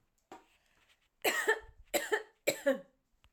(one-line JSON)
{"three_cough_length": "3.3 s", "three_cough_amplitude": 5085, "three_cough_signal_mean_std_ratio": 0.38, "survey_phase": "alpha (2021-03-01 to 2021-08-12)", "age": "45-64", "gender": "Female", "wearing_mask": "No", "symptom_none": true, "symptom_onset": "9 days", "smoker_status": "Ex-smoker", "respiratory_condition_asthma": true, "respiratory_condition_other": false, "recruitment_source": "REACT", "submission_delay": "2 days", "covid_test_result": "Negative", "covid_test_method": "RT-qPCR"}